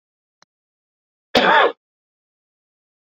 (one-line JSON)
{"cough_length": "3.1 s", "cough_amplitude": 30314, "cough_signal_mean_std_ratio": 0.27, "survey_phase": "beta (2021-08-13 to 2022-03-07)", "age": "45-64", "gender": "Male", "wearing_mask": "No", "symptom_none": true, "smoker_status": "Never smoked", "respiratory_condition_asthma": false, "respiratory_condition_other": false, "recruitment_source": "REACT", "submission_delay": "1 day", "covid_test_result": "Positive", "covid_test_method": "RT-qPCR", "covid_ct_value": 19.8, "covid_ct_gene": "E gene", "influenza_a_test_result": "Negative", "influenza_b_test_result": "Negative"}